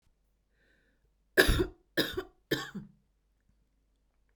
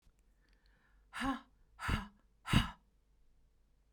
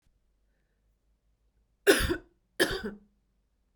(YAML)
three_cough_length: 4.4 s
three_cough_amplitude: 16951
three_cough_signal_mean_std_ratio: 0.28
exhalation_length: 3.9 s
exhalation_amplitude: 6623
exhalation_signal_mean_std_ratio: 0.31
cough_length: 3.8 s
cough_amplitude: 14294
cough_signal_mean_std_ratio: 0.27
survey_phase: beta (2021-08-13 to 2022-03-07)
age: 45-64
gender: Female
wearing_mask: 'No'
symptom_none: true
smoker_status: Never smoked
respiratory_condition_asthma: false
respiratory_condition_other: false
recruitment_source: REACT
submission_delay: 2 days
covid_test_result: Negative
covid_test_method: RT-qPCR